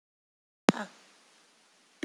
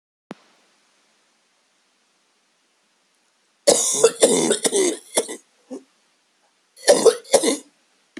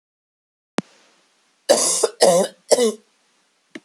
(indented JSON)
{
  "exhalation_length": "2.0 s",
  "exhalation_amplitude": 28746,
  "exhalation_signal_mean_std_ratio": 0.15,
  "cough_length": "8.2 s",
  "cough_amplitude": 32768,
  "cough_signal_mean_std_ratio": 0.35,
  "three_cough_length": "3.8 s",
  "three_cough_amplitude": 32767,
  "three_cough_signal_mean_std_ratio": 0.38,
  "survey_phase": "beta (2021-08-13 to 2022-03-07)",
  "age": "45-64",
  "gender": "Female",
  "wearing_mask": "No",
  "symptom_cough_any": true,
  "symptom_runny_or_blocked_nose": true,
  "symptom_fatigue": true,
  "smoker_status": "Ex-smoker",
  "respiratory_condition_asthma": true,
  "respiratory_condition_other": true,
  "recruitment_source": "REACT",
  "submission_delay": "2 days",
  "covid_test_result": "Negative",
  "covid_test_method": "RT-qPCR"
}